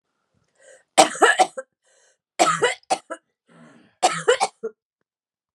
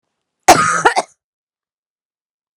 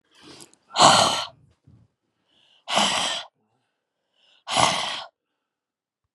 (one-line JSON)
{"three_cough_length": "5.5 s", "three_cough_amplitude": 32767, "three_cough_signal_mean_std_ratio": 0.34, "cough_length": "2.6 s", "cough_amplitude": 32768, "cough_signal_mean_std_ratio": 0.31, "exhalation_length": "6.1 s", "exhalation_amplitude": 30498, "exhalation_signal_mean_std_ratio": 0.36, "survey_phase": "beta (2021-08-13 to 2022-03-07)", "age": "45-64", "gender": "Female", "wearing_mask": "No", "symptom_cough_any": true, "symptom_runny_or_blocked_nose": true, "symptom_shortness_of_breath": true, "symptom_sore_throat": true, "symptom_fatigue": true, "symptom_headache": true, "symptom_change_to_sense_of_smell_or_taste": true, "symptom_loss_of_taste": true, "symptom_onset": "5 days", "smoker_status": "Never smoked", "respiratory_condition_asthma": false, "respiratory_condition_other": false, "recruitment_source": "Test and Trace", "submission_delay": "2 days", "covid_test_result": "Positive", "covid_test_method": "RT-qPCR", "covid_ct_value": 14.0, "covid_ct_gene": "ORF1ab gene", "covid_ct_mean": 14.4, "covid_viral_load": "19000000 copies/ml", "covid_viral_load_category": "High viral load (>1M copies/ml)"}